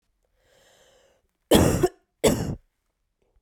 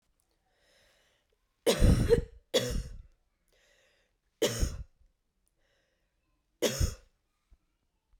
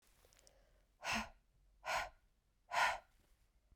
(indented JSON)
{
  "cough_length": "3.4 s",
  "cough_amplitude": 25083,
  "cough_signal_mean_std_ratio": 0.33,
  "three_cough_length": "8.2 s",
  "three_cough_amplitude": 9745,
  "three_cough_signal_mean_std_ratio": 0.32,
  "exhalation_length": "3.8 s",
  "exhalation_amplitude": 2470,
  "exhalation_signal_mean_std_ratio": 0.36,
  "survey_phase": "beta (2021-08-13 to 2022-03-07)",
  "age": "18-44",
  "gender": "Female",
  "wearing_mask": "No",
  "symptom_cough_any": true,
  "symptom_runny_or_blocked_nose": true,
  "symptom_sore_throat": true,
  "symptom_abdominal_pain": true,
  "symptom_fever_high_temperature": true,
  "symptom_headache": true,
  "smoker_status": "Never smoked",
  "respiratory_condition_asthma": false,
  "respiratory_condition_other": false,
  "recruitment_source": "Test and Trace",
  "submission_delay": "1 day",
  "covid_test_result": "Positive",
  "covid_test_method": "LFT"
}